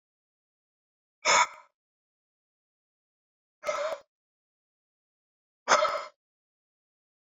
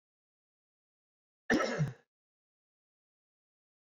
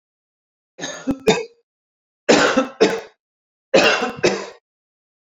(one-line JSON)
{"exhalation_length": "7.3 s", "exhalation_amplitude": 15100, "exhalation_signal_mean_std_ratio": 0.25, "cough_length": "3.9 s", "cough_amplitude": 5469, "cough_signal_mean_std_ratio": 0.25, "three_cough_length": "5.2 s", "three_cough_amplitude": 29006, "three_cough_signal_mean_std_ratio": 0.41, "survey_phase": "beta (2021-08-13 to 2022-03-07)", "age": "45-64", "gender": "Male", "wearing_mask": "No", "symptom_none": true, "smoker_status": "Never smoked", "respiratory_condition_asthma": false, "respiratory_condition_other": false, "recruitment_source": "REACT", "submission_delay": "8 days", "covid_test_result": "Negative", "covid_test_method": "RT-qPCR"}